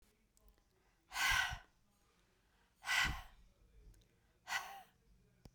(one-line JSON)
{"exhalation_length": "5.5 s", "exhalation_amplitude": 2343, "exhalation_signal_mean_std_ratio": 0.36, "survey_phase": "beta (2021-08-13 to 2022-03-07)", "age": "45-64", "gender": "Female", "wearing_mask": "No", "symptom_runny_or_blocked_nose": true, "symptom_fatigue": true, "symptom_headache": true, "symptom_onset": "7 days", "smoker_status": "Never smoked", "respiratory_condition_asthma": false, "respiratory_condition_other": false, "recruitment_source": "REACT", "submission_delay": "0 days", "covid_test_result": "Negative", "covid_test_method": "RT-qPCR"}